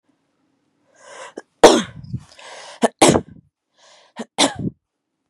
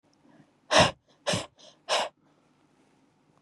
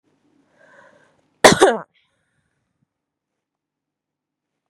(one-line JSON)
{"three_cough_length": "5.3 s", "three_cough_amplitude": 32768, "three_cough_signal_mean_std_ratio": 0.27, "exhalation_length": "3.4 s", "exhalation_amplitude": 15599, "exhalation_signal_mean_std_ratio": 0.29, "cough_length": "4.7 s", "cough_amplitude": 32768, "cough_signal_mean_std_ratio": 0.18, "survey_phase": "beta (2021-08-13 to 2022-03-07)", "age": "18-44", "gender": "Female", "wearing_mask": "No", "symptom_none": true, "smoker_status": "Never smoked", "respiratory_condition_asthma": false, "respiratory_condition_other": false, "recruitment_source": "REACT", "submission_delay": "6 days", "covid_test_result": "Negative", "covid_test_method": "RT-qPCR"}